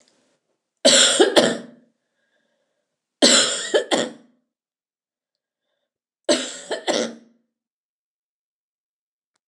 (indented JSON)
{
  "three_cough_length": "9.5 s",
  "three_cough_amplitude": 29203,
  "three_cough_signal_mean_std_ratio": 0.33,
  "survey_phase": "alpha (2021-03-01 to 2021-08-12)",
  "age": "45-64",
  "gender": "Female",
  "wearing_mask": "No",
  "symptom_none": true,
  "symptom_onset": "6 days",
  "smoker_status": "Never smoked",
  "respiratory_condition_asthma": false,
  "respiratory_condition_other": false,
  "recruitment_source": "REACT",
  "submission_delay": "1 day",
  "covid_test_result": "Negative",
  "covid_test_method": "RT-qPCR"
}